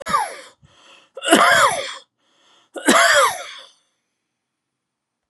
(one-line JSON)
{"three_cough_length": "5.3 s", "three_cough_amplitude": 32768, "three_cough_signal_mean_std_ratio": 0.42, "survey_phase": "beta (2021-08-13 to 2022-03-07)", "age": "65+", "gender": "Male", "wearing_mask": "No", "symptom_cough_any": true, "smoker_status": "Never smoked", "respiratory_condition_asthma": false, "respiratory_condition_other": false, "recruitment_source": "REACT", "submission_delay": "2 days", "covid_test_result": "Negative", "covid_test_method": "RT-qPCR", "influenza_a_test_result": "Negative", "influenza_b_test_result": "Negative"}